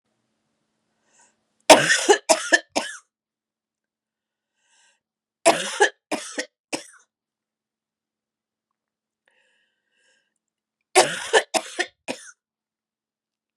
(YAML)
three_cough_length: 13.6 s
three_cough_amplitude: 32768
three_cough_signal_mean_std_ratio: 0.24
survey_phase: beta (2021-08-13 to 2022-03-07)
age: 45-64
gender: Female
wearing_mask: 'No'
symptom_cough_any: true
symptom_runny_or_blocked_nose: true
symptom_abdominal_pain: true
symptom_fatigue: true
symptom_fever_high_temperature: true
symptom_headache: true
symptom_change_to_sense_of_smell_or_taste: true
smoker_status: Never smoked
respiratory_condition_asthma: false
respiratory_condition_other: false
recruitment_source: Test and Trace
submission_delay: 1 day
covid_test_result: Positive
covid_test_method: LFT